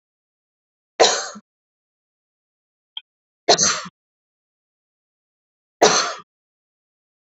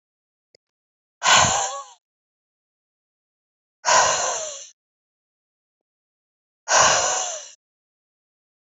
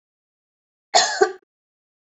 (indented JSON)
{
  "three_cough_length": "7.3 s",
  "three_cough_amplitude": 29449,
  "three_cough_signal_mean_std_ratio": 0.25,
  "exhalation_length": "8.6 s",
  "exhalation_amplitude": 27089,
  "exhalation_signal_mean_std_ratio": 0.35,
  "cough_length": "2.1 s",
  "cough_amplitude": 27441,
  "cough_signal_mean_std_ratio": 0.28,
  "survey_phase": "beta (2021-08-13 to 2022-03-07)",
  "age": "18-44",
  "gender": "Female",
  "wearing_mask": "No",
  "symptom_runny_or_blocked_nose": true,
  "symptom_shortness_of_breath": true,
  "symptom_headache": true,
  "smoker_status": "Current smoker (e-cigarettes or vapes only)",
  "respiratory_condition_asthma": false,
  "respiratory_condition_other": false,
  "recruitment_source": "Test and Trace",
  "submission_delay": "2 days",
  "covid_test_result": "Positive",
  "covid_test_method": "RT-qPCR",
  "covid_ct_value": 15.2,
  "covid_ct_gene": "ORF1ab gene",
  "covid_ct_mean": 15.4,
  "covid_viral_load": "9100000 copies/ml",
  "covid_viral_load_category": "High viral load (>1M copies/ml)"
}